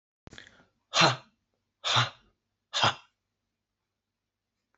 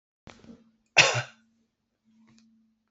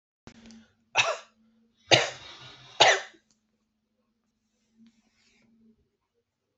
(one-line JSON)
{"exhalation_length": "4.8 s", "exhalation_amplitude": 15763, "exhalation_signal_mean_std_ratio": 0.28, "cough_length": "2.9 s", "cough_amplitude": 21081, "cough_signal_mean_std_ratio": 0.22, "three_cough_length": "6.6 s", "three_cough_amplitude": 26689, "three_cough_signal_mean_std_ratio": 0.23, "survey_phase": "alpha (2021-03-01 to 2021-08-12)", "age": "45-64", "gender": "Female", "wearing_mask": "No", "symptom_none": true, "smoker_status": "Ex-smoker", "respiratory_condition_asthma": false, "respiratory_condition_other": false, "recruitment_source": "REACT", "submission_delay": "4 days", "covid_test_result": "Negative", "covid_test_method": "RT-qPCR"}